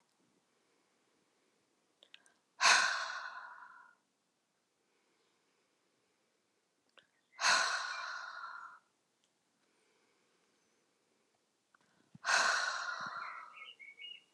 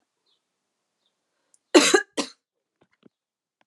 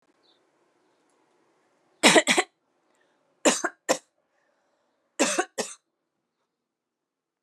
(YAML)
exhalation_length: 14.3 s
exhalation_amplitude: 6477
exhalation_signal_mean_std_ratio: 0.32
cough_length: 3.7 s
cough_amplitude: 24839
cough_signal_mean_std_ratio: 0.21
three_cough_length: 7.4 s
three_cough_amplitude: 26364
three_cough_signal_mean_std_ratio: 0.25
survey_phase: alpha (2021-03-01 to 2021-08-12)
age: 45-64
gender: Female
wearing_mask: 'No'
symptom_fatigue: true
symptom_headache: true
symptom_change_to_sense_of_smell_or_taste: true
smoker_status: Never smoked
respiratory_condition_asthma: false
respiratory_condition_other: false
recruitment_source: Test and Trace
submission_delay: 1 day
covid_test_result: Positive
covid_test_method: RT-qPCR
covid_ct_value: 14.8
covid_ct_gene: ORF1ab gene
covid_ct_mean: 15.1
covid_viral_load: 11000000 copies/ml
covid_viral_load_category: High viral load (>1M copies/ml)